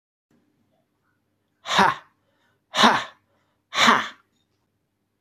{"exhalation_length": "5.2 s", "exhalation_amplitude": 24823, "exhalation_signal_mean_std_ratio": 0.3, "survey_phase": "beta (2021-08-13 to 2022-03-07)", "age": "45-64", "gender": "Male", "wearing_mask": "No", "symptom_cough_any": true, "symptom_runny_or_blocked_nose": true, "symptom_sore_throat": true, "symptom_abdominal_pain": true, "symptom_diarrhoea": true, "symptom_fatigue": true, "symptom_headache": true, "symptom_onset": "2 days", "smoker_status": "Ex-smoker", "respiratory_condition_asthma": false, "respiratory_condition_other": false, "recruitment_source": "Test and Trace", "submission_delay": "2 days", "covid_test_result": "Positive", "covid_test_method": "RT-qPCR", "covid_ct_value": 24.4, "covid_ct_gene": "N gene", "covid_ct_mean": 25.2, "covid_viral_load": "5400 copies/ml", "covid_viral_load_category": "Minimal viral load (< 10K copies/ml)"}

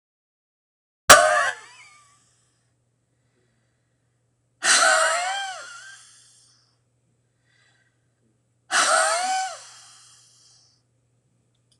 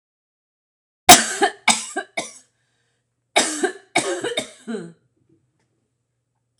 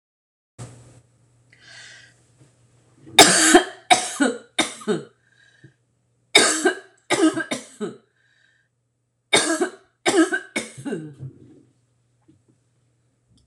{"exhalation_length": "11.8 s", "exhalation_amplitude": 26028, "exhalation_signal_mean_std_ratio": 0.31, "cough_length": "6.6 s", "cough_amplitude": 26028, "cough_signal_mean_std_ratio": 0.29, "three_cough_length": "13.5 s", "three_cough_amplitude": 26028, "three_cough_signal_mean_std_ratio": 0.34, "survey_phase": "beta (2021-08-13 to 2022-03-07)", "age": "45-64", "gender": "Female", "wearing_mask": "No", "symptom_none": true, "smoker_status": "Never smoked", "respiratory_condition_asthma": false, "respiratory_condition_other": false, "recruitment_source": "REACT", "submission_delay": "4 days", "covid_test_result": "Negative", "covid_test_method": "RT-qPCR", "covid_ct_value": 39.0, "covid_ct_gene": "N gene"}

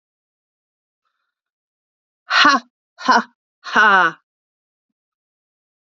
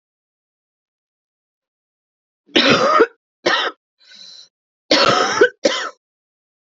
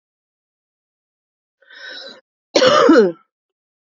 {"exhalation_length": "5.9 s", "exhalation_amplitude": 29146, "exhalation_signal_mean_std_ratio": 0.29, "three_cough_length": "6.7 s", "three_cough_amplitude": 29777, "three_cough_signal_mean_std_ratio": 0.38, "cough_length": "3.8 s", "cough_amplitude": 31571, "cough_signal_mean_std_ratio": 0.33, "survey_phase": "alpha (2021-03-01 to 2021-08-12)", "age": "18-44", "gender": "Female", "wearing_mask": "No", "symptom_cough_any": true, "symptom_shortness_of_breath": true, "symptom_diarrhoea": true, "symptom_fatigue": true, "symptom_headache": true, "symptom_change_to_sense_of_smell_or_taste": true, "symptom_onset": "5 days", "smoker_status": "Ex-smoker", "respiratory_condition_asthma": true, "respiratory_condition_other": false, "recruitment_source": "Test and Trace", "submission_delay": "4 days", "covid_test_result": "Positive", "covid_test_method": "RT-qPCR", "covid_ct_value": 13.7, "covid_ct_gene": "ORF1ab gene", "covid_ct_mean": 13.8, "covid_viral_load": "31000000 copies/ml", "covid_viral_load_category": "High viral load (>1M copies/ml)"}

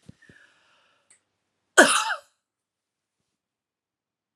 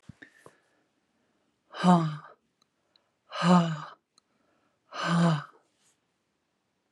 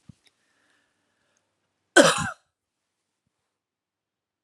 {"cough_length": "4.4 s", "cough_amplitude": 29321, "cough_signal_mean_std_ratio": 0.19, "exhalation_length": "6.9 s", "exhalation_amplitude": 11723, "exhalation_signal_mean_std_ratio": 0.34, "three_cough_length": "4.4 s", "three_cough_amplitude": 29412, "three_cough_signal_mean_std_ratio": 0.18, "survey_phase": "alpha (2021-03-01 to 2021-08-12)", "age": "45-64", "gender": "Female", "wearing_mask": "No", "symptom_none": true, "smoker_status": "Never smoked", "respiratory_condition_asthma": false, "respiratory_condition_other": false, "recruitment_source": "REACT", "submission_delay": "1 day", "covid_test_result": "Negative", "covid_test_method": "RT-qPCR"}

